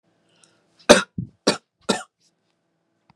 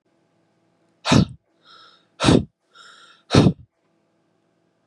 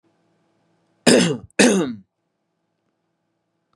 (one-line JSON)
{"three_cough_length": "3.2 s", "three_cough_amplitude": 32768, "three_cough_signal_mean_std_ratio": 0.21, "exhalation_length": "4.9 s", "exhalation_amplitude": 30240, "exhalation_signal_mean_std_ratio": 0.28, "cough_length": "3.8 s", "cough_amplitude": 32767, "cough_signal_mean_std_ratio": 0.31, "survey_phase": "beta (2021-08-13 to 2022-03-07)", "age": "18-44", "gender": "Male", "wearing_mask": "No", "symptom_none": true, "smoker_status": "Never smoked", "respiratory_condition_asthma": false, "respiratory_condition_other": false, "recruitment_source": "REACT", "submission_delay": "2 days", "covid_test_result": "Negative", "covid_test_method": "RT-qPCR", "influenza_a_test_result": "Negative", "influenza_b_test_result": "Negative"}